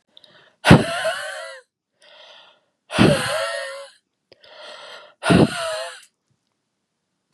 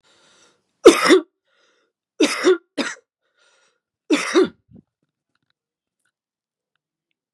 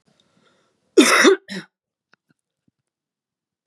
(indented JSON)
{
  "exhalation_length": "7.3 s",
  "exhalation_amplitude": 32768,
  "exhalation_signal_mean_std_ratio": 0.35,
  "three_cough_length": "7.3 s",
  "three_cough_amplitude": 32768,
  "three_cough_signal_mean_std_ratio": 0.27,
  "cough_length": "3.7 s",
  "cough_amplitude": 31223,
  "cough_signal_mean_std_ratio": 0.27,
  "survey_phase": "beta (2021-08-13 to 2022-03-07)",
  "age": "18-44",
  "gender": "Female",
  "wearing_mask": "No",
  "symptom_cough_any": true,
  "symptom_runny_or_blocked_nose": true,
  "symptom_shortness_of_breath": true,
  "smoker_status": "Ex-smoker",
  "respiratory_condition_asthma": true,
  "respiratory_condition_other": false,
  "recruitment_source": "Test and Trace",
  "submission_delay": "1 day",
  "covid_test_result": "Positive",
  "covid_test_method": "LFT"
}